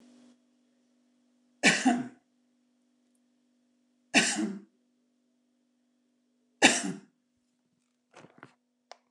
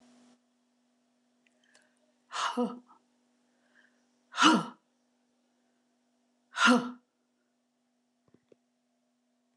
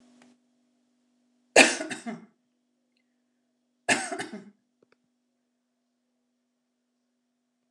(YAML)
three_cough_length: 9.1 s
three_cough_amplitude: 26857
three_cough_signal_mean_std_ratio: 0.25
exhalation_length: 9.6 s
exhalation_amplitude: 14453
exhalation_signal_mean_std_ratio: 0.23
cough_length: 7.7 s
cough_amplitude: 28336
cough_signal_mean_std_ratio: 0.19
survey_phase: alpha (2021-03-01 to 2021-08-12)
age: 65+
gender: Female
wearing_mask: 'No'
symptom_none: true
smoker_status: Never smoked
respiratory_condition_asthma: false
respiratory_condition_other: false
recruitment_source: REACT
submission_delay: 2 days
covid_test_result: Negative
covid_test_method: RT-qPCR